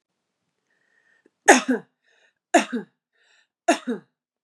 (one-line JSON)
{"three_cough_length": "4.4 s", "three_cough_amplitude": 32684, "three_cough_signal_mean_std_ratio": 0.25, "survey_phase": "beta (2021-08-13 to 2022-03-07)", "age": "45-64", "gender": "Female", "wearing_mask": "No", "symptom_none": true, "smoker_status": "Never smoked", "respiratory_condition_asthma": false, "respiratory_condition_other": false, "recruitment_source": "REACT", "submission_delay": "0 days", "covid_test_result": "Negative", "covid_test_method": "RT-qPCR", "influenza_a_test_result": "Negative", "influenza_b_test_result": "Negative"}